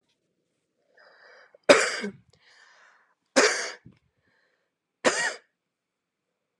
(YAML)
three_cough_length: 6.6 s
three_cough_amplitude: 26816
three_cough_signal_mean_std_ratio: 0.26
survey_phase: beta (2021-08-13 to 2022-03-07)
age: 18-44
gender: Female
wearing_mask: 'No'
symptom_fatigue: true
symptom_onset: 13 days
smoker_status: Never smoked
respiratory_condition_asthma: false
respiratory_condition_other: false
recruitment_source: REACT
submission_delay: 2 days
covid_test_result: Negative
covid_test_method: RT-qPCR
influenza_a_test_result: Negative
influenza_b_test_result: Negative